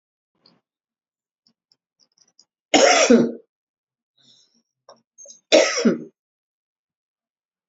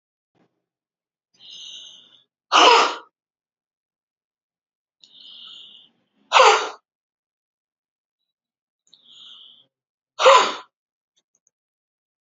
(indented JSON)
{
  "cough_length": "7.7 s",
  "cough_amplitude": 28510,
  "cough_signal_mean_std_ratio": 0.28,
  "exhalation_length": "12.2 s",
  "exhalation_amplitude": 32768,
  "exhalation_signal_mean_std_ratio": 0.24,
  "survey_phase": "beta (2021-08-13 to 2022-03-07)",
  "age": "65+",
  "gender": "Female",
  "wearing_mask": "No",
  "symptom_none": true,
  "smoker_status": "Never smoked",
  "respiratory_condition_asthma": true,
  "respiratory_condition_other": false,
  "recruitment_source": "REACT",
  "submission_delay": "1 day",
  "covid_test_result": "Negative",
  "covid_test_method": "RT-qPCR"
}